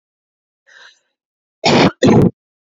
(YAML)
cough_length: 2.7 s
cough_amplitude: 29710
cough_signal_mean_std_ratio: 0.38
survey_phase: beta (2021-08-13 to 2022-03-07)
age: 18-44
gender: Female
wearing_mask: 'No'
symptom_cough_any: true
symptom_runny_or_blocked_nose: true
symptom_sore_throat: true
symptom_diarrhoea: true
symptom_fatigue: true
symptom_fever_high_temperature: true
symptom_headache: true
symptom_onset: 3 days
smoker_status: Ex-smoker
respiratory_condition_asthma: false
respiratory_condition_other: false
recruitment_source: Test and Trace
submission_delay: 2 days
covid_test_result: Positive
covid_test_method: RT-qPCR
covid_ct_value: 33.7
covid_ct_gene: N gene